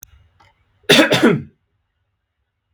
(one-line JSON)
{"cough_length": "2.7 s", "cough_amplitude": 32768, "cough_signal_mean_std_ratio": 0.34, "survey_phase": "beta (2021-08-13 to 2022-03-07)", "age": "18-44", "gender": "Male", "wearing_mask": "No", "symptom_none": true, "smoker_status": "Ex-smoker", "respiratory_condition_asthma": false, "respiratory_condition_other": false, "recruitment_source": "REACT", "submission_delay": "1 day", "covid_test_result": "Negative", "covid_test_method": "RT-qPCR", "influenza_a_test_result": "Negative", "influenza_b_test_result": "Negative"}